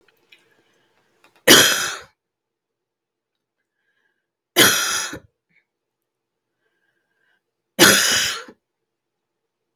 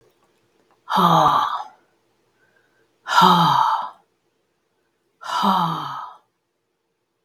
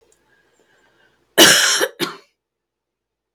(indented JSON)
{
  "three_cough_length": "9.8 s",
  "three_cough_amplitude": 32768,
  "three_cough_signal_mean_std_ratio": 0.28,
  "exhalation_length": "7.2 s",
  "exhalation_amplitude": 31049,
  "exhalation_signal_mean_std_ratio": 0.44,
  "cough_length": "3.3 s",
  "cough_amplitude": 32768,
  "cough_signal_mean_std_ratio": 0.31,
  "survey_phase": "beta (2021-08-13 to 2022-03-07)",
  "age": "45-64",
  "gender": "Female",
  "wearing_mask": "No",
  "symptom_cough_any": true,
  "symptom_runny_or_blocked_nose": true,
  "symptom_fatigue": true,
  "smoker_status": "Never smoked",
  "respiratory_condition_asthma": false,
  "respiratory_condition_other": false,
  "recruitment_source": "REACT",
  "submission_delay": "1 day",
  "covid_test_result": "Negative",
  "covid_test_method": "RT-qPCR",
  "influenza_a_test_result": "Negative",
  "influenza_b_test_result": "Negative"
}